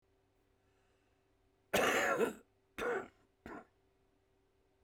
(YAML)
cough_length: 4.8 s
cough_amplitude: 3786
cough_signal_mean_std_ratio: 0.36
survey_phase: beta (2021-08-13 to 2022-03-07)
age: 65+
gender: Male
wearing_mask: 'No'
symptom_runny_or_blocked_nose: true
symptom_headache: true
smoker_status: Current smoker (11 or more cigarettes per day)
respiratory_condition_asthma: false
respiratory_condition_other: true
recruitment_source: Test and Trace
submission_delay: 2 days
covid_test_result: Positive
covid_test_method: RT-qPCR
covid_ct_value: 21.1
covid_ct_gene: N gene